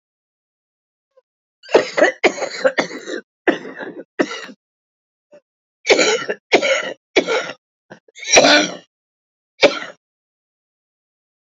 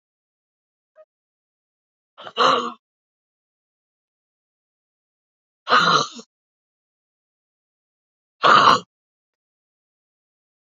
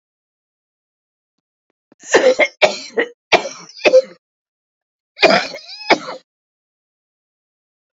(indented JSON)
{
  "cough_length": "11.5 s",
  "cough_amplitude": 31498,
  "cough_signal_mean_std_ratio": 0.36,
  "exhalation_length": "10.7 s",
  "exhalation_amplitude": 27840,
  "exhalation_signal_mean_std_ratio": 0.24,
  "three_cough_length": "7.9 s",
  "three_cough_amplitude": 31632,
  "three_cough_signal_mean_std_ratio": 0.31,
  "survey_phase": "beta (2021-08-13 to 2022-03-07)",
  "age": "65+",
  "gender": "Female",
  "wearing_mask": "No",
  "symptom_cough_any": true,
  "symptom_shortness_of_breath": true,
  "symptom_onset": "11 days",
  "smoker_status": "Never smoked",
  "respiratory_condition_asthma": true,
  "respiratory_condition_other": false,
  "recruitment_source": "REACT",
  "submission_delay": "1 day",
  "covid_test_result": "Negative",
  "covid_test_method": "RT-qPCR",
  "influenza_a_test_result": "Negative",
  "influenza_b_test_result": "Negative"
}